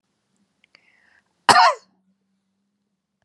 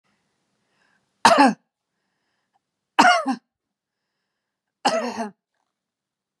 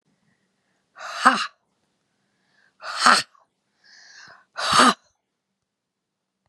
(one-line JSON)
{"cough_length": "3.2 s", "cough_amplitude": 32768, "cough_signal_mean_std_ratio": 0.22, "three_cough_length": "6.4 s", "three_cough_amplitude": 32767, "three_cough_signal_mean_std_ratio": 0.27, "exhalation_length": "6.5 s", "exhalation_amplitude": 32642, "exhalation_signal_mean_std_ratio": 0.27, "survey_phase": "beta (2021-08-13 to 2022-03-07)", "age": "45-64", "gender": "Female", "wearing_mask": "No", "symptom_headache": true, "smoker_status": "Never smoked", "respiratory_condition_asthma": false, "respiratory_condition_other": false, "recruitment_source": "REACT", "submission_delay": "1 day", "covid_test_result": "Negative", "covid_test_method": "RT-qPCR", "influenza_a_test_result": "Negative", "influenza_b_test_result": "Negative"}